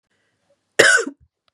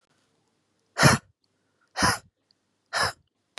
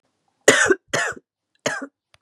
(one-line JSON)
{"cough_length": "1.5 s", "cough_amplitude": 32768, "cough_signal_mean_std_ratio": 0.33, "exhalation_length": "3.6 s", "exhalation_amplitude": 22592, "exhalation_signal_mean_std_ratio": 0.29, "three_cough_length": "2.2 s", "three_cough_amplitude": 32768, "three_cough_signal_mean_std_ratio": 0.37, "survey_phase": "beta (2021-08-13 to 2022-03-07)", "age": "45-64", "gender": "Female", "wearing_mask": "No", "symptom_new_continuous_cough": true, "symptom_shortness_of_breath": true, "symptom_fatigue": true, "symptom_fever_high_temperature": true, "symptom_headache": true, "symptom_onset": "4 days", "smoker_status": "Ex-smoker", "respiratory_condition_asthma": false, "respiratory_condition_other": false, "recruitment_source": "Test and Trace", "submission_delay": "2 days", "covid_test_result": "Positive", "covid_test_method": "RT-qPCR", "covid_ct_value": 19.9, "covid_ct_gene": "ORF1ab gene", "covid_ct_mean": 20.3, "covid_viral_load": "210000 copies/ml", "covid_viral_load_category": "Low viral load (10K-1M copies/ml)"}